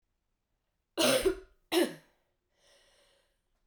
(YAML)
cough_length: 3.7 s
cough_amplitude: 6402
cough_signal_mean_std_ratio: 0.32
survey_phase: beta (2021-08-13 to 2022-03-07)
age: 18-44
gender: Female
wearing_mask: 'No'
symptom_cough_any: true
symptom_new_continuous_cough: true
symptom_runny_or_blocked_nose: true
symptom_fatigue: true
symptom_headache: true
symptom_change_to_sense_of_smell_or_taste: true
symptom_other: true
symptom_onset: 4 days
smoker_status: Never smoked
respiratory_condition_asthma: false
respiratory_condition_other: false
recruitment_source: Test and Trace
submission_delay: 2 days
covid_test_result: Positive
covid_test_method: RT-qPCR
covid_ct_value: 20.0
covid_ct_gene: ORF1ab gene